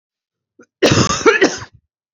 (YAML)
cough_length: 2.1 s
cough_amplitude: 32768
cough_signal_mean_std_ratio: 0.44
survey_phase: beta (2021-08-13 to 2022-03-07)
age: 18-44
gender: Female
wearing_mask: 'No'
symptom_cough_any: true
symptom_new_continuous_cough: true
symptom_runny_or_blocked_nose: true
symptom_sore_throat: true
symptom_onset: 3 days
smoker_status: Never smoked
respiratory_condition_asthma: false
respiratory_condition_other: false
recruitment_source: Test and Trace
submission_delay: 1 day
covid_test_result: Positive
covid_test_method: RT-qPCR
covid_ct_value: 22.5
covid_ct_gene: ORF1ab gene
covid_ct_mean: 22.7
covid_viral_load: 36000 copies/ml
covid_viral_load_category: Low viral load (10K-1M copies/ml)